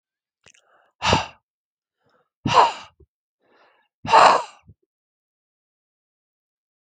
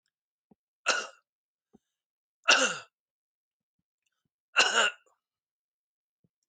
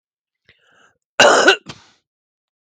{"exhalation_length": "6.9 s", "exhalation_amplitude": 32766, "exhalation_signal_mean_std_ratio": 0.26, "three_cough_length": "6.5 s", "three_cough_amplitude": 14921, "three_cough_signal_mean_std_ratio": 0.26, "cough_length": "2.7 s", "cough_amplitude": 32768, "cough_signal_mean_std_ratio": 0.3, "survey_phase": "beta (2021-08-13 to 2022-03-07)", "age": "45-64", "gender": "Male", "wearing_mask": "No", "symptom_cough_any": true, "symptom_fatigue": true, "symptom_change_to_sense_of_smell_or_taste": true, "symptom_loss_of_taste": true, "symptom_other": true, "symptom_onset": "7 days", "smoker_status": "Never smoked", "respiratory_condition_asthma": true, "respiratory_condition_other": false, "recruitment_source": "Test and Trace", "submission_delay": "1 day", "covid_test_result": "Positive", "covid_test_method": "RT-qPCR", "covid_ct_value": 20.7, "covid_ct_gene": "ORF1ab gene", "covid_ct_mean": 21.0, "covid_viral_load": "130000 copies/ml", "covid_viral_load_category": "Low viral load (10K-1M copies/ml)"}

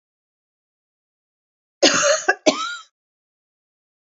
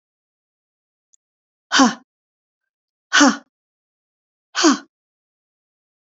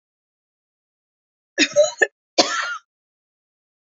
{"cough_length": "4.2 s", "cough_amplitude": 32538, "cough_signal_mean_std_ratio": 0.3, "exhalation_length": "6.1 s", "exhalation_amplitude": 29042, "exhalation_signal_mean_std_ratio": 0.25, "three_cough_length": "3.8 s", "three_cough_amplitude": 32369, "three_cough_signal_mean_std_ratio": 0.29, "survey_phase": "beta (2021-08-13 to 2022-03-07)", "age": "65+", "gender": "Female", "wearing_mask": "No", "symptom_cough_any": true, "symptom_other": true, "symptom_onset": "6 days", "smoker_status": "Never smoked", "respiratory_condition_asthma": false, "respiratory_condition_other": true, "recruitment_source": "REACT", "submission_delay": "2 days", "covid_test_result": "Negative", "covid_test_method": "RT-qPCR", "influenza_a_test_result": "Negative", "influenza_b_test_result": "Negative"}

